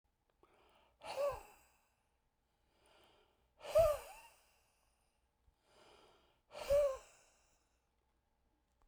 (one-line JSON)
{"exhalation_length": "8.9 s", "exhalation_amplitude": 2778, "exhalation_signal_mean_std_ratio": 0.27, "survey_phase": "beta (2021-08-13 to 2022-03-07)", "age": "45-64", "gender": "Male", "wearing_mask": "No", "symptom_none": true, "smoker_status": "Never smoked", "respiratory_condition_asthma": false, "respiratory_condition_other": false, "recruitment_source": "REACT", "submission_delay": "2 days", "covid_test_result": "Negative", "covid_test_method": "RT-qPCR"}